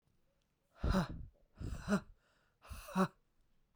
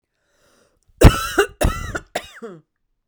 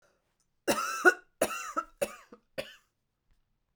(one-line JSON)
{"exhalation_length": "3.8 s", "exhalation_amplitude": 2862, "exhalation_signal_mean_std_ratio": 0.39, "cough_length": "3.1 s", "cough_amplitude": 32768, "cough_signal_mean_std_ratio": 0.3, "three_cough_length": "3.8 s", "three_cough_amplitude": 14065, "three_cough_signal_mean_std_ratio": 0.31, "survey_phase": "beta (2021-08-13 to 2022-03-07)", "age": "45-64", "gender": "Female", "wearing_mask": "No", "symptom_new_continuous_cough": true, "symptom_runny_or_blocked_nose": true, "symptom_shortness_of_breath": true, "symptom_fatigue": true, "symptom_headache": true, "symptom_onset": "2 days", "smoker_status": "Never smoked", "respiratory_condition_asthma": true, "respiratory_condition_other": false, "recruitment_source": "Test and Trace", "submission_delay": "1 day", "covid_test_result": "Positive", "covid_test_method": "RT-qPCR"}